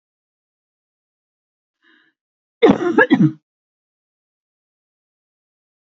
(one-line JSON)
{"cough_length": "5.8 s", "cough_amplitude": 30684, "cough_signal_mean_std_ratio": 0.24, "survey_phase": "beta (2021-08-13 to 2022-03-07)", "age": "18-44", "gender": "Female", "wearing_mask": "No", "symptom_none": true, "smoker_status": "Never smoked", "respiratory_condition_asthma": false, "respiratory_condition_other": false, "recruitment_source": "REACT", "submission_delay": "1 day", "covid_test_result": "Negative", "covid_test_method": "RT-qPCR", "influenza_a_test_result": "Negative", "influenza_b_test_result": "Negative"}